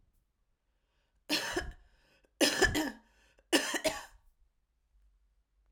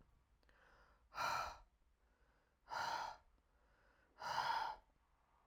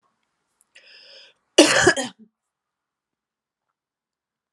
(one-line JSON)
{"three_cough_length": "5.7 s", "three_cough_amplitude": 8179, "three_cough_signal_mean_std_ratio": 0.35, "exhalation_length": "5.5 s", "exhalation_amplitude": 1251, "exhalation_signal_mean_std_ratio": 0.45, "cough_length": "4.5 s", "cough_amplitude": 32767, "cough_signal_mean_std_ratio": 0.23, "survey_phase": "alpha (2021-03-01 to 2021-08-12)", "age": "45-64", "gender": "Female", "wearing_mask": "No", "symptom_cough_any": true, "symptom_fatigue": true, "symptom_headache": true, "smoker_status": "Never smoked", "respiratory_condition_asthma": false, "respiratory_condition_other": false, "recruitment_source": "Test and Trace", "submission_delay": "2 days", "covid_test_result": "Positive", "covid_test_method": "RT-qPCR", "covid_ct_value": 24.1, "covid_ct_gene": "ORF1ab gene", "covid_ct_mean": 24.7, "covid_viral_load": "7800 copies/ml", "covid_viral_load_category": "Minimal viral load (< 10K copies/ml)"}